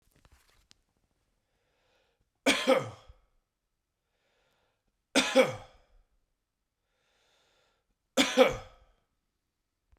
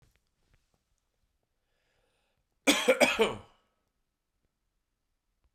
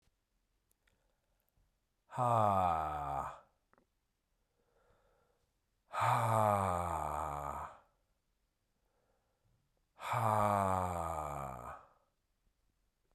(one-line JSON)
{"three_cough_length": "10.0 s", "three_cough_amplitude": 13575, "three_cough_signal_mean_std_ratio": 0.24, "cough_length": "5.5 s", "cough_amplitude": 14580, "cough_signal_mean_std_ratio": 0.24, "exhalation_length": "13.1 s", "exhalation_amplitude": 3950, "exhalation_signal_mean_std_ratio": 0.45, "survey_phase": "alpha (2021-03-01 to 2021-08-12)", "age": "18-44", "gender": "Male", "wearing_mask": "No", "symptom_cough_any": true, "symptom_fatigue": true, "symptom_fever_high_temperature": true, "symptom_change_to_sense_of_smell_or_taste": true, "symptom_loss_of_taste": true, "symptom_onset": "4 days", "smoker_status": "Never smoked", "respiratory_condition_asthma": false, "respiratory_condition_other": false, "recruitment_source": "Test and Trace", "submission_delay": "1 day", "covid_test_result": "Positive", "covid_test_method": "RT-qPCR", "covid_ct_value": 19.4, "covid_ct_gene": "ORF1ab gene", "covid_ct_mean": 20.1, "covid_viral_load": "250000 copies/ml", "covid_viral_load_category": "Low viral load (10K-1M copies/ml)"}